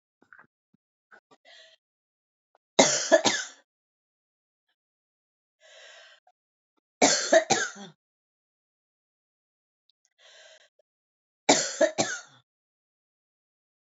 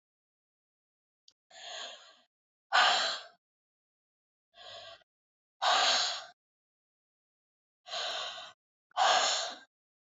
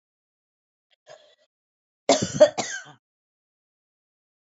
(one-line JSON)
{"three_cough_length": "13.9 s", "three_cough_amplitude": 23834, "three_cough_signal_mean_std_ratio": 0.24, "exhalation_length": "10.2 s", "exhalation_amplitude": 6958, "exhalation_signal_mean_std_ratio": 0.36, "cough_length": "4.4 s", "cough_amplitude": 22307, "cough_signal_mean_std_ratio": 0.21, "survey_phase": "beta (2021-08-13 to 2022-03-07)", "age": "45-64", "gender": "Female", "wearing_mask": "No", "symptom_none": true, "smoker_status": "Ex-smoker", "respiratory_condition_asthma": false, "respiratory_condition_other": false, "recruitment_source": "REACT", "submission_delay": "2 days", "covid_test_result": "Negative", "covid_test_method": "RT-qPCR", "influenza_a_test_result": "Negative", "influenza_b_test_result": "Negative"}